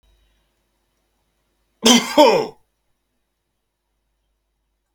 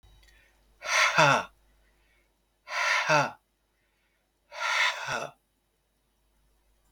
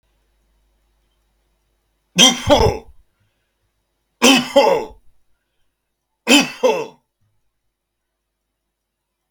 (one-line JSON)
{"cough_length": "4.9 s", "cough_amplitude": 32768, "cough_signal_mean_std_ratio": 0.25, "exhalation_length": "6.9 s", "exhalation_amplitude": 16261, "exhalation_signal_mean_std_ratio": 0.39, "three_cough_length": "9.3 s", "three_cough_amplitude": 32768, "three_cough_signal_mean_std_ratio": 0.31, "survey_phase": "beta (2021-08-13 to 2022-03-07)", "age": "45-64", "gender": "Male", "wearing_mask": "No", "symptom_none": true, "smoker_status": "Never smoked", "respiratory_condition_asthma": false, "respiratory_condition_other": false, "recruitment_source": "REACT", "submission_delay": "2 days", "covid_test_result": "Negative", "covid_test_method": "RT-qPCR", "influenza_a_test_result": "Negative", "influenza_b_test_result": "Negative"}